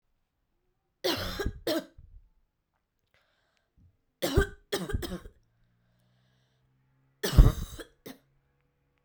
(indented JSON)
{
  "three_cough_length": "9.0 s",
  "three_cough_amplitude": 22259,
  "three_cough_signal_mean_std_ratio": 0.25,
  "survey_phase": "beta (2021-08-13 to 2022-03-07)",
  "age": "18-44",
  "gender": "Female",
  "wearing_mask": "No",
  "symptom_cough_any": true,
  "symptom_runny_or_blocked_nose": true,
  "symptom_onset": "7 days",
  "smoker_status": "Never smoked",
  "respiratory_condition_asthma": false,
  "respiratory_condition_other": false,
  "recruitment_source": "Test and Trace",
  "submission_delay": "3 days",
  "covid_test_result": "Positive",
  "covid_test_method": "RT-qPCR"
}